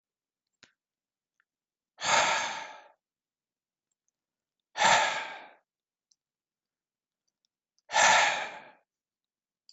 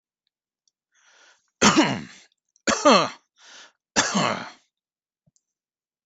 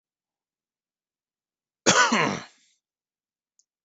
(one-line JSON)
{"exhalation_length": "9.7 s", "exhalation_amplitude": 12830, "exhalation_signal_mean_std_ratio": 0.31, "three_cough_length": "6.1 s", "three_cough_amplitude": 23634, "three_cough_signal_mean_std_ratio": 0.33, "cough_length": "3.8 s", "cough_amplitude": 19183, "cough_signal_mean_std_ratio": 0.27, "survey_phase": "beta (2021-08-13 to 2022-03-07)", "age": "45-64", "gender": "Male", "wearing_mask": "No", "symptom_none": true, "smoker_status": "Ex-smoker", "respiratory_condition_asthma": false, "respiratory_condition_other": false, "recruitment_source": "REACT", "submission_delay": "1 day", "covid_test_result": "Negative", "covid_test_method": "RT-qPCR", "influenza_a_test_result": "Unknown/Void", "influenza_b_test_result": "Unknown/Void"}